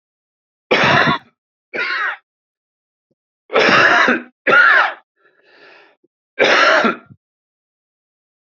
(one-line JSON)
{"three_cough_length": "8.4 s", "three_cough_amplitude": 32767, "three_cough_signal_mean_std_ratio": 0.46, "survey_phase": "beta (2021-08-13 to 2022-03-07)", "age": "45-64", "gender": "Male", "wearing_mask": "No", "symptom_cough_any": true, "symptom_shortness_of_breath": true, "symptom_sore_throat": true, "symptom_abdominal_pain": true, "symptom_headache": true, "symptom_change_to_sense_of_smell_or_taste": true, "symptom_other": true, "symptom_onset": "9 days", "smoker_status": "Ex-smoker", "respiratory_condition_asthma": true, "respiratory_condition_other": false, "recruitment_source": "REACT", "submission_delay": "2 days", "covid_test_result": "Negative", "covid_test_method": "RT-qPCR", "influenza_a_test_result": "Negative", "influenza_b_test_result": "Negative"}